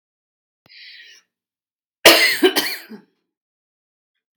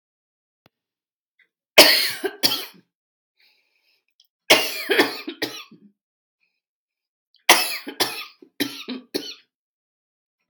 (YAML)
cough_length: 4.4 s
cough_amplitude: 32768
cough_signal_mean_std_ratio: 0.28
three_cough_length: 10.5 s
three_cough_amplitude: 32768
three_cough_signal_mean_std_ratio: 0.28
survey_phase: beta (2021-08-13 to 2022-03-07)
age: 65+
gender: Female
wearing_mask: 'No'
symptom_none: true
symptom_onset: 6 days
smoker_status: Never smoked
respiratory_condition_asthma: false
respiratory_condition_other: false
recruitment_source: REACT
submission_delay: 1 day
covid_test_result: Negative
covid_test_method: RT-qPCR
influenza_a_test_result: Negative
influenza_b_test_result: Negative